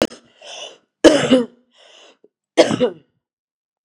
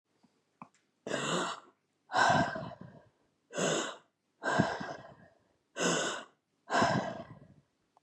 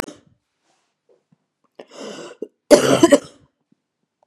{
  "three_cough_length": "3.8 s",
  "three_cough_amplitude": 32768,
  "three_cough_signal_mean_std_ratio": 0.33,
  "exhalation_length": "8.0 s",
  "exhalation_amplitude": 8192,
  "exhalation_signal_mean_std_ratio": 0.48,
  "cough_length": "4.3 s",
  "cough_amplitude": 32768,
  "cough_signal_mean_std_ratio": 0.25,
  "survey_phase": "beta (2021-08-13 to 2022-03-07)",
  "age": "45-64",
  "gender": "Female",
  "wearing_mask": "No",
  "symptom_cough_any": true,
  "symptom_new_continuous_cough": true,
  "symptom_runny_or_blocked_nose": true,
  "symptom_shortness_of_breath": true,
  "symptom_sore_throat": true,
  "symptom_abdominal_pain": true,
  "symptom_fatigue": true,
  "symptom_fever_high_temperature": true,
  "symptom_headache": true,
  "symptom_change_to_sense_of_smell_or_taste": true,
  "symptom_loss_of_taste": true,
  "symptom_onset": "3 days",
  "smoker_status": "Ex-smoker",
  "respiratory_condition_asthma": false,
  "respiratory_condition_other": false,
  "recruitment_source": "Test and Trace",
  "submission_delay": "1 day",
  "covid_test_result": "Positive",
  "covid_test_method": "ePCR"
}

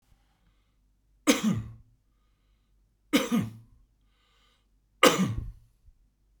{
  "three_cough_length": "6.4 s",
  "three_cough_amplitude": 19519,
  "three_cough_signal_mean_std_ratio": 0.31,
  "survey_phase": "beta (2021-08-13 to 2022-03-07)",
  "age": "45-64",
  "gender": "Male",
  "wearing_mask": "No",
  "symptom_none": true,
  "smoker_status": "Never smoked",
  "respiratory_condition_asthma": false,
  "respiratory_condition_other": false,
  "recruitment_source": "REACT",
  "submission_delay": "1 day",
  "covid_test_result": "Negative",
  "covid_test_method": "RT-qPCR"
}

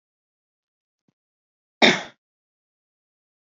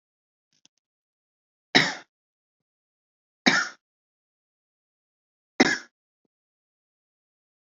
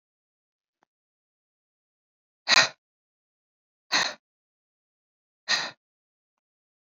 {
  "cough_length": "3.6 s",
  "cough_amplitude": 29689,
  "cough_signal_mean_std_ratio": 0.16,
  "three_cough_length": "7.8 s",
  "three_cough_amplitude": 27334,
  "three_cough_signal_mean_std_ratio": 0.18,
  "exhalation_length": "6.8 s",
  "exhalation_amplitude": 20432,
  "exhalation_signal_mean_std_ratio": 0.2,
  "survey_phase": "beta (2021-08-13 to 2022-03-07)",
  "age": "18-44",
  "gender": "Male",
  "wearing_mask": "No",
  "symptom_none": true,
  "smoker_status": "Ex-smoker",
  "respiratory_condition_asthma": true,
  "respiratory_condition_other": false,
  "recruitment_source": "REACT",
  "submission_delay": "3 days",
  "covid_test_result": "Negative",
  "covid_test_method": "RT-qPCR",
  "influenza_a_test_result": "Negative",
  "influenza_b_test_result": "Negative"
}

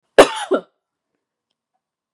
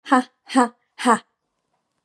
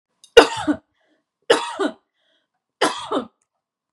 {
  "cough_length": "2.1 s",
  "cough_amplitude": 32768,
  "cough_signal_mean_std_ratio": 0.22,
  "exhalation_length": "2.0 s",
  "exhalation_amplitude": 28984,
  "exhalation_signal_mean_std_ratio": 0.34,
  "three_cough_length": "3.9 s",
  "three_cough_amplitude": 32768,
  "three_cough_signal_mean_std_ratio": 0.29,
  "survey_phase": "beta (2021-08-13 to 2022-03-07)",
  "age": "18-44",
  "gender": "Female",
  "wearing_mask": "No",
  "symptom_none": true,
  "smoker_status": "Never smoked",
  "respiratory_condition_asthma": false,
  "respiratory_condition_other": false,
  "recruitment_source": "REACT",
  "submission_delay": "1 day",
  "covid_test_result": "Negative",
  "covid_test_method": "RT-qPCR",
  "influenza_a_test_result": "Negative",
  "influenza_b_test_result": "Negative"
}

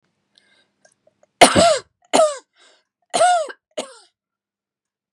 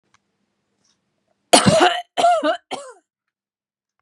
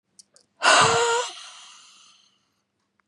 {
  "three_cough_length": "5.1 s",
  "three_cough_amplitude": 32768,
  "three_cough_signal_mean_std_ratio": 0.33,
  "cough_length": "4.0 s",
  "cough_amplitude": 32768,
  "cough_signal_mean_std_ratio": 0.36,
  "exhalation_length": "3.1 s",
  "exhalation_amplitude": 22374,
  "exhalation_signal_mean_std_ratio": 0.39,
  "survey_phase": "beta (2021-08-13 to 2022-03-07)",
  "age": "45-64",
  "gender": "Female",
  "wearing_mask": "No",
  "symptom_none": true,
  "smoker_status": "Never smoked",
  "respiratory_condition_asthma": false,
  "respiratory_condition_other": false,
  "recruitment_source": "REACT",
  "submission_delay": "2 days",
  "covid_test_result": "Negative",
  "covid_test_method": "RT-qPCR",
  "influenza_a_test_result": "Negative",
  "influenza_b_test_result": "Negative"
}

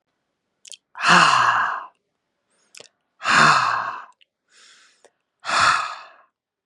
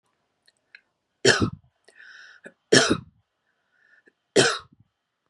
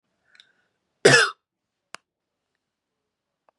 {
  "exhalation_length": "6.7 s",
  "exhalation_amplitude": 31191,
  "exhalation_signal_mean_std_ratio": 0.43,
  "three_cough_length": "5.3 s",
  "three_cough_amplitude": 30475,
  "three_cough_signal_mean_std_ratio": 0.28,
  "cough_length": "3.6 s",
  "cough_amplitude": 31611,
  "cough_signal_mean_std_ratio": 0.2,
  "survey_phase": "beta (2021-08-13 to 2022-03-07)",
  "age": "45-64",
  "gender": "Female",
  "wearing_mask": "No",
  "symptom_none": true,
  "smoker_status": "Never smoked",
  "respiratory_condition_asthma": false,
  "respiratory_condition_other": false,
  "recruitment_source": "REACT",
  "submission_delay": "1 day",
  "covid_test_result": "Negative",
  "covid_test_method": "RT-qPCR",
  "influenza_a_test_result": "Negative",
  "influenza_b_test_result": "Negative"
}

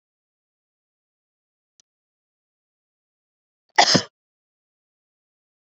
{
  "cough_length": "5.7 s",
  "cough_amplitude": 28499,
  "cough_signal_mean_std_ratio": 0.15,
  "survey_phase": "beta (2021-08-13 to 2022-03-07)",
  "age": "45-64",
  "gender": "Female",
  "wearing_mask": "No",
  "symptom_none": true,
  "smoker_status": "Never smoked",
  "respiratory_condition_asthma": true,
  "respiratory_condition_other": false,
  "recruitment_source": "REACT",
  "submission_delay": "1 day",
  "covid_test_result": "Negative",
  "covid_test_method": "RT-qPCR"
}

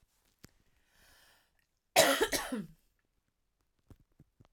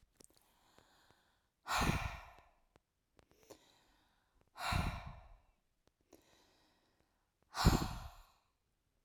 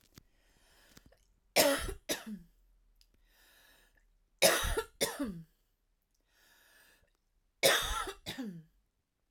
{
  "cough_length": "4.5 s",
  "cough_amplitude": 10709,
  "cough_signal_mean_std_ratio": 0.26,
  "exhalation_length": "9.0 s",
  "exhalation_amplitude": 5468,
  "exhalation_signal_mean_std_ratio": 0.29,
  "three_cough_length": "9.3 s",
  "three_cough_amplitude": 9867,
  "three_cough_signal_mean_std_ratio": 0.33,
  "survey_phase": "beta (2021-08-13 to 2022-03-07)",
  "age": "45-64",
  "gender": "Female",
  "wearing_mask": "No",
  "symptom_none": true,
  "smoker_status": "Ex-smoker",
  "respiratory_condition_asthma": false,
  "respiratory_condition_other": false,
  "recruitment_source": "REACT",
  "submission_delay": "0 days",
  "covid_test_result": "Negative",
  "covid_test_method": "RT-qPCR"
}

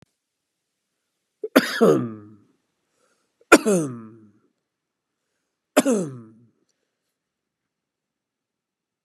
{
  "three_cough_length": "9.0 s",
  "three_cough_amplitude": 32767,
  "three_cough_signal_mean_std_ratio": 0.25,
  "survey_phase": "beta (2021-08-13 to 2022-03-07)",
  "age": "65+",
  "gender": "Male",
  "wearing_mask": "No",
  "symptom_none": true,
  "smoker_status": "Never smoked",
  "respiratory_condition_asthma": true,
  "respiratory_condition_other": false,
  "recruitment_source": "REACT",
  "submission_delay": "4 days",
  "covid_test_result": "Negative",
  "covid_test_method": "RT-qPCR",
  "influenza_a_test_result": "Negative",
  "influenza_b_test_result": "Negative"
}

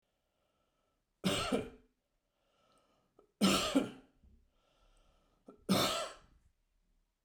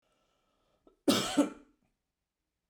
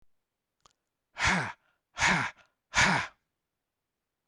{
  "three_cough_length": "7.2 s",
  "three_cough_amplitude": 4768,
  "three_cough_signal_mean_std_ratio": 0.34,
  "cough_length": "2.7 s",
  "cough_amplitude": 7355,
  "cough_signal_mean_std_ratio": 0.29,
  "exhalation_length": "4.3 s",
  "exhalation_amplitude": 8750,
  "exhalation_signal_mean_std_ratio": 0.37,
  "survey_phase": "beta (2021-08-13 to 2022-03-07)",
  "age": "45-64",
  "gender": "Male",
  "wearing_mask": "No",
  "symptom_none": true,
  "smoker_status": "Never smoked",
  "respiratory_condition_asthma": false,
  "respiratory_condition_other": false,
  "recruitment_source": "REACT",
  "submission_delay": "2 days",
  "covid_test_result": "Negative",
  "covid_test_method": "RT-qPCR"
}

